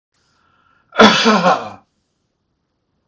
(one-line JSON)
{"cough_length": "3.1 s", "cough_amplitude": 32768, "cough_signal_mean_std_ratio": 0.35, "survey_phase": "beta (2021-08-13 to 2022-03-07)", "age": "65+", "gender": "Male", "wearing_mask": "No", "symptom_none": true, "smoker_status": "Never smoked", "respiratory_condition_asthma": false, "respiratory_condition_other": false, "recruitment_source": "REACT", "submission_delay": "3 days", "covid_test_result": "Negative", "covid_test_method": "RT-qPCR"}